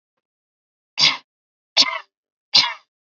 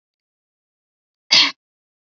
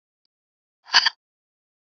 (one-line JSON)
{"three_cough_length": "3.1 s", "three_cough_amplitude": 32664, "three_cough_signal_mean_std_ratio": 0.3, "cough_length": "2.0 s", "cough_amplitude": 32587, "cough_signal_mean_std_ratio": 0.23, "exhalation_length": "1.9 s", "exhalation_amplitude": 28501, "exhalation_signal_mean_std_ratio": 0.2, "survey_phase": "beta (2021-08-13 to 2022-03-07)", "age": "18-44", "gender": "Female", "wearing_mask": "No", "symptom_none": true, "smoker_status": "Never smoked", "respiratory_condition_asthma": false, "respiratory_condition_other": false, "recruitment_source": "REACT", "submission_delay": "2 days", "covid_test_result": "Negative", "covid_test_method": "RT-qPCR"}